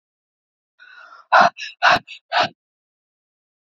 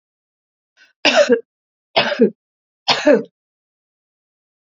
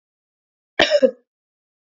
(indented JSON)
{
  "exhalation_length": "3.7 s",
  "exhalation_amplitude": 27639,
  "exhalation_signal_mean_std_ratio": 0.3,
  "three_cough_length": "4.8 s",
  "three_cough_amplitude": 31022,
  "three_cough_signal_mean_std_ratio": 0.33,
  "cough_length": "2.0 s",
  "cough_amplitude": 28742,
  "cough_signal_mean_std_ratio": 0.27,
  "survey_phase": "beta (2021-08-13 to 2022-03-07)",
  "age": "45-64",
  "gender": "Female",
  "wearing_mask": "No",
  "symptom_none": true,
  "smoker_status": "Ex-smoker",
  "respiratory_condition_asthma": false,
  "respiratory_condition_other": false,
  "recruitment_source": "Test and Trace",
  "submission_delay": "1 day",
  "covid_test_result": "Positive",
  "covid_test_method": "RT-qPCR",
  "covid_ct_value": 32.2,
  "covid_ct_gene": "N gene"
}